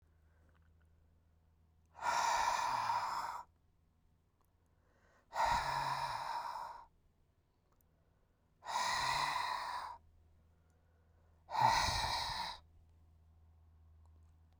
{
  "exhalation_length": "14.6 s",
  "exhalation_amplitude": 4542,
  "exhalation_signal_mean_std_ratio": 0.51,
  "survey_phase": "beta (2021-08-13 to 2022-03-07)",
  "age": "45-64",
  "gender": "Male",
  "wearing_mask": "No",
  "symptom_cough_any": true,
  "symptom_runny_or_blocked_nose": true,
  "symptom_abdominal_pain": true,
  "symptom_fever_high_temperature": true,
  "symptom_headache": true,
  "symptom_change_to_sense_of_smell_or_taste": true,
  "symptom_loss_of_taste": true,
  "smoker_status": "Never smoked",
  "respiratory_condition_asthma": false,
  "respiratory_condition_other": false,
  "recruitment_source": "Test and Trace",
  "submission_delay": "2 days",
  "covid_test_result": "Positive",
  "covid_test_method": "LFT"
}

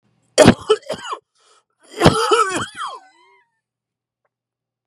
{
  "cough_length": "4.9 s",
  "cough_amplitude": 32768,
  "cough_signal_mean_std_ratio": 0.33,
  "survey_phase": "beta (2021-08-13 to 2022-03-07)",
  "age": "45-64",
  "gender": "Male",
  "wearing_mask": "No",
  "symptom_cough_any": true,
  "symptom_new_continuous_cough": true,
  "symptom_shortness_of_breath": true,
  "symptom_sore_throat": true,
  "symptom_abdominal_pain": true,
  "symptom_diarrhoea": true,
  "symptom_fatigue": true,
  "symptom_headache": true,
  "smoker_status": "Never smoked",
  "respiratory_condition_asthma": false,
  "respiratory_condition_other": false,
  "recruitment_source": "Test and Trace",
  "submission_delay": "1 day",
  "covid_test_result": "Positive",
  "covid_test_method": "ePCR"
}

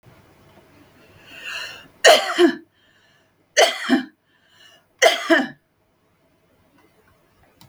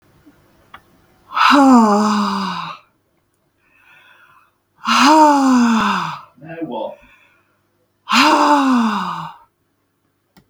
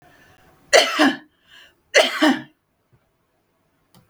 {
  "three_cough_length": "7.7 s",
  "three_cough_amplitude": 32768,
  "three_cough_signal_mean_std_ratio": 0.31,
  "exhalation_length": "10.5 s",
  "exhalation_amplitude": 32768,
  "exhalation_signal_mean_std_ratio": 0.52,
  "cough_length": "4.1 s",
  "cough_amplitude": 32768,
  "cough_signal_mean_std_ratio": 0.33,
  "survey_phase": "beta (2021-08-13 to 2022-03-07)",
  "age": "45-64",
  "gender": "Female",
  "wearing_mask": "No",
  "symptom_cough_any": true,
  "symptom_fatigue": true,
  "smoker_status": "Ex-smoker",
  "respiratory_condition_asthma": true,
  "respiratory_condition_other": false,
  "recruitment_source": "REACT",
  "submission_delay": "1 day",
  "covid_test_result": "Negative",
  "covid_test_method": "RT-qPCR",
  "influenza_a_test_result": "Negative",
  "influenza_b_test_result": "Negative"
}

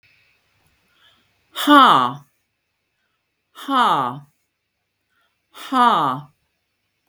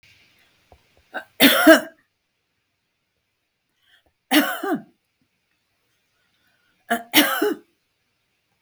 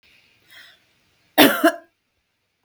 {
  "exhalation_length": "7.1 s",
  "exhalation_amplitude": 32768,
  "exhalation_signal_mean_std_ratio": 0.34,
  "three_cough_length": "8.6 s",
  "three_cough_amplitude": 32768,
  "three_cough_signal_mean_std_ratio": 0.28,
  "cough_length": "2.6 s",
  "cough_amplitude": 32768,
  "cough_signal_mean_std_ratio": 0.26,
  "survey_phase": "beta (2021-08-13 to 2022-03-07)",
  "age": "65+",
  "gender": "Female",
  "wearing_mask": "No",
  "symptom_none": true,
  "smoker_status": "Ex-smoker",
  "respiratory_condition_asthma": false,
  "respiratory_condition_other": false,
  "recruitment_source": "REACT",
  "submission_delay": "2 days",
  "covid_test_result": "Negative",
  "covid_test_method": "RT-qPCR",
  "influenza_a_test_result": "Negative",
  "influenza_b_test_result": "Negative"
}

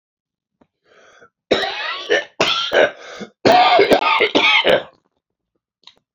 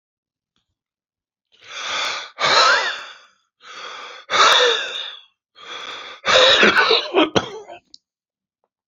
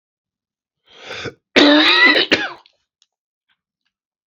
{
  "three_cough_length": "6.1 s",
  "three_cough_amplitude": 31937,
  "three_cough_signal_mean_std_ratio": 0.51,
  "exhalation_length": "8.9 s",
  "exhalation_amplitude": 28541,
  "exhalation_signal_mean_std_ratio": 0.47,
  "cough_length": "4.3 s",
  "cough_amplitude": 32767,
  "cough_signal_mean_std_ratio": 0.38,
  "survey_phase": "beta (2021-08-13 to 2022-03-07)",
  "age": "65+",
  "gender": "Male",
  "wearing_mask": "No",
  "symptom_none": true,
  "smoker_status": "Never smoked",
  "respiratory_condition_asthma": false,
  "respiratory_condition_other": false,
  "recruitment_source": "REACT",
  "submission_delay": "5 days",
  "covid_test_result": "Negative",
  "covid_test_method": "RT-qPCR",
  "influenza_a_test_result": "Negative",
  "influenza_b_test_result": "Negative"
}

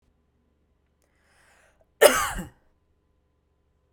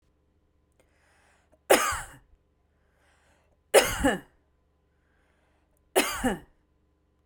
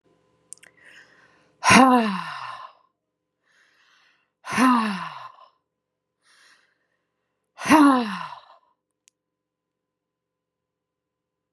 {
  "cough_length": "3.9 s",
  "cough_amplitude": 31977,
  "cough_signal_mean_std_ratio": 0.2,
  "three_cough_length": "7.3 s",
  "three_cough_amplitude": 23222,
  "three_cough_signal_mean_std_ratio": 0.27,
  "exhalation_length": "11.5 s",
  "exhalation_amplitude": 31119,
  "exhalation_signal_mean_std_ratio": 0.29,
  "survey_phase": "beta (2021-08-13 to 2022-03-07)",
  "age": "45-64",
  "gender": "Female",
  "wearing_mask": "No",
  "symptom_none": true,
  "smoker_status": "Never smoked",
  "respiratory_condition_asthma": false,
  "respiratory_condition_other": false,
  "recruitment_source": "REACT",
  "submission_delay": "1 day",
  "covid_test_result": "Negative",
  "covid_test_method": "RT-qPCR",
  "influenza_a_test_result": "Unknown/Void",
  "influenza_b_test_result": "Unknown/Void"
}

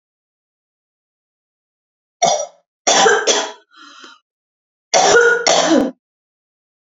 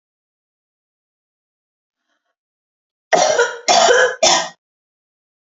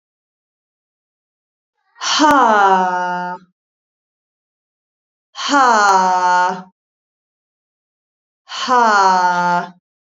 {
  "three_cough_length": "7.0 s",
  "three_cough_amplitude": 32767,
  "three_cough_signal_mean_std_ratio": 0.42,
  "cough_length": "5.5 s",
  "cough_amplitude": 32767,
  "cough_signal_mean_std_ratio": 0.36,
  "exhalation_length": "10.1 s",
  "exhalation_amplitude": 29438,
  "exhalation_signal_mean_std_ratio": 0.49,
  "survey_phase": "beta (2021-08-13 to 2022-03-07)",
  "age": "18-44",
  "gender": "Female",
  "wearing_mask": "No",
  "symptom_cough_any": true,
  "symptom_fatigue": true,
  "symptom_headache": true,
  "symptom_onset": "4 days",
  "smoker_status": "Never smoked",
  "respiratory_condition_asthma": false,
  "respiratory_condition_other": false,
  "recruitment_source": "REACT",
  "submission_delay": "0 days",
  "covid_test_result": "Negative",
  "covid_test_method": "RT-qPCR",
  "influenza_a_test_result": "Negative",
  "influenza_b_test_result": "Negative"
}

